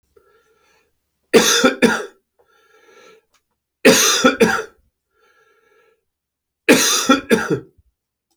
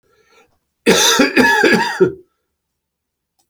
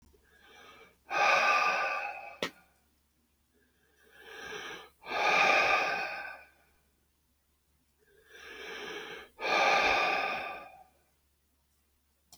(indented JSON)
{
  "three_cough_length": "8.4 s",
  "three_cough_amplitude": 32768,
  "three_cough_signal_mean_std_ratio": 0.39,
  "cough_length": "3.5 s",
  "cough_amplitude": 32767,
  "cough_signal_mean_std_ratio": 0.49,
  "exhalation_length": "12.4 s",
  "exhalation_amplitude": 8186,
  "exhalation_signal_mean_std_ratio": 0.47,
  "survey_phase": "beta (2021-08-13 to 2022-03-07)",
  "age": "45-64",
  "gender": "Male",
  "wearing_mask": "No",
  "symptom_none": true,
  "smoker_status": "Never smoked",
  "respiratory_condition_asthma": false,
  "respiratory_condition_other": false,
  "recruitment_source": "REACT",
  "submission_delay": "0 days",
  "covid_test_result": "Negative",
  "covid_test_method": "RT-qPCR"
}